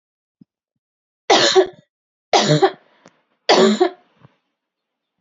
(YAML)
three_cough_length: 5.2 s
three_cough_amplitude: 31664
three_cough_signal_mean_std_ratio: 0.37
survey_phase: beta (2021-08-13 to 2022-03-07)
age: 18-44
gender: Female
wearing_mask: 'No'
symptom_cough_any: true
symptom_runny_or_blocked_nose: true
symptom_shortness_of_breath: true
symptom_sore_throat: true
symptom_fatigue: true
symptom_onset: 3 days
smoker_status: Ex-smoker
respiratory_condition_asthma: false
respiratory_condition_other: false
recruitment_source: Test and Trace
submission_delay: 1 day
covid_test_result: Positive
covid_test_method: RT-qPCR
covid_ct_value: 19.1
covid_ct_gene: ORF1ab gene